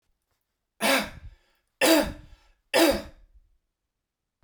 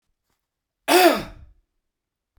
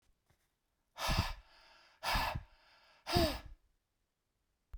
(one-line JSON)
{"three_cough_length": "4.4 s", "three_cough_amplitude": 16730, "three_cough_signal_mean_std_ratio": 0.35, "cough_length": "2.4 s", "cough_amplitude": 28134, "cough_signal_mean_std_ratio": 0.29, "exhalation_length": "4.8 s", "exhalation_amplitude": 5088, "exhalation_signal_mean_std_ratio": 0.38, "survey_phase": "beta (2021-08-13 to 2022-03-07)", "age": "65+", "gender": "Male", "wearing_mask": "No", "symptom_none": true, "smoker_status": "Ex-smoker", "respiratory_condition_asthma": false, "respiratory_condition_other": false, "recruitment_source": "REACT", "submission_delay": "4 days", "covid_test_result": "Negative", "covid_test_method": "RT-qPCR"}